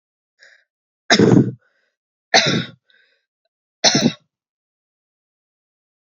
{"three_cough_length": "6.1 s", "three_cough_amplitude": 32507, "three_cough_signal_mean_std_ratio": 0.3, "survey_phase": "beta (2021-08-13 to 2022-03-07)", "age": "18-44", "gender": "Female", "wearing_mask": "No", "symptom_cough_any": true, "symptom_runny_or_blocked_nose": true, "symptom_shortness_of_breath": true, "symptom_headache": true, "symptom_change_to_sense_of_smell_or_taste": true, "symptom_loss_of_taste": true, "symptom_onset": "4 days", "smoker_status": "Ex-smoker", "respiratory_condition_asthma": false, "respiratory_condition_other": false, "recruitment_source": "Test and Trace", "submission_delay": "1 day", "covid_test_result": "Positive", "covid_test_method": "RT-qPCR", "covid_ct_value": 23.2, "covid_ct_gene": "N gene"}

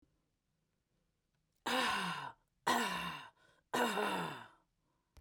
{"exhalation_length": "5.2 s", "exhalation_amplitude": 3075, "exhalation_signal_mean_std_ratio": 0.49, "survey_phase": "beta (2021-08-13 to 2022-03-07)", "age": "65+", "gender": "Female", "wearing_mask": "No", "symptom_cough_any": true, "symptom_runny_or_blocked_nose": true, "symptom_sore_throat": true, "symptom_onset": "4 days", "smoker_status": "Never smoked", "respiratory_condition_asthma": false, "respiratory_condition_other": false, "recruitment_source": "REACT", "submission_delay": "1 day", "covid_test_result": "Negative", "covid_test_method": "RT-qPCR", "influenza_a_test_result": "Unknown/Void", "influenza_b_test_result": "Unknown/Void"}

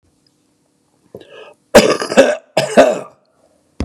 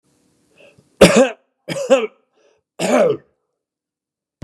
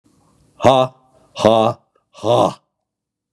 {"cough_length": "3.8 s", "cough_amplitude": 32768, "cough_signal_mean_std_ratio": 0.36, "three_cough_length": "4.4 s", "three_cough_amplitude": 32768, "three_cough_signal_mean_std_ratio": 0.34, "exhalation_length": "3.3 s", "exhalation_amplitude": 32768, "exhalation_signal_mean_std_ratio": 0.38, "survey_phase": "beta (2021-08-13 to 2022-03-07)", "age": "45-64", "gender": "Male", "wearing_mask": "No", "symptom_cough_any": true, "symptom_runny_or_blocked_nose": true, "symptom_onset": "3 days", "smoker_status": "Ex-smoker", "respiratory_condition_asthma": false, "respiratory_condition_other": false, "recruitment_source": "Test and Trace", "submission_delay": "1 day", "covid_test_result": "Positive", "covid_test_method": "RT-qPCR", "covid_ct_value": 18.6, "covid_ct_gene": "N gene"}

